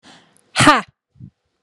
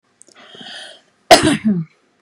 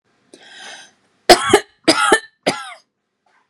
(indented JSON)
{
  "exhalation_length": "1.6 s",
  "exhalation_amplitude": 32767,
  "exhalation_signal_mean_std_ratio": 0.3,
  "cough_length": "2.2 s",
  "cough_amplitude": 32768,
  "cough_signal_mean_std_ratio": 0.35,
  "three_cough_length": "3.5 s",
  "three_cough_amplitude": 32768,
  "three_cough_signal_mean_std_ratio": 0.32,
  "survey_phase": "beta (2021-08-13 to 2022-03-07)",
  "age": "18-44",
  "gender": "Female",
  "wearing_mask": "No",
  "symptom_none": true,
  "smoker_status": "Never smoked",
  "respiratory_condition_asthma": false,
  "respiratory_condition_other": false,
  "recruitment_source": "REACT",
  "submission_delay": "1 day",
  "covid_test_result": "Negative",
  "covid_test_method": "RT-qPCR"
}